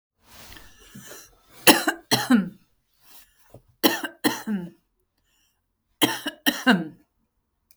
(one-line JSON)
{"three_cough_length": "7.8 s", "three_cough_amplitude": 32768, "three_cough_signal_mean_std_ratio": 0.32, "survey_phase": "beta (2021-08-13 to 2022-03-07)", "age": "45-64", "gender": "Female", "wearing_mask": "No", "symptom_none": true, "smoker_status": "Never smoked", "respiratory_condition_asthma": true, "respiratory_condition_other": false, "recruitment_source": "REACT", "submission_delay": "4 days", "covid_test_result": "Negative", "covid_test_method": "RT-qPCR"}